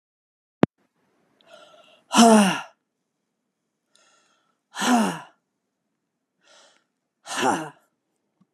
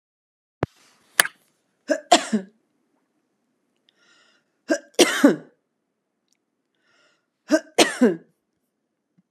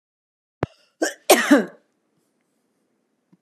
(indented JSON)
{
  "exhalation_length": "8.5 s",
  "exhalation_amplitude": 32691,
  "exhalation_signal_mean_std_ratio": 0.26,
  "three_cough_length": "9.3 s",
  "three_cough_amplitude": 32768,
  "three_cough_signal_mean_std_ratio": 0.25,
  "cough_length": "3.4 s",
  "cough_amplitude": 31573,
  "cough_signal_mean_std_ratio": 0.25,
  "survey_phase": "beta (2021-08-13 to 2022-03-07)",
  "age": "45-64",
  "gender": "Female",
  "wearing_mask": "No",
  "symptom_none": true,
  "smoker_status": "Never smoked",
  "respiratory_condition_asthma": false,
  "respiratory_condition_other": false,
  "recruitment_source": "REACT",
  "submission_delay": "1 day",
  "covid_test_result": "Negative",
  "covid_test_method": "RT-qPCR"
}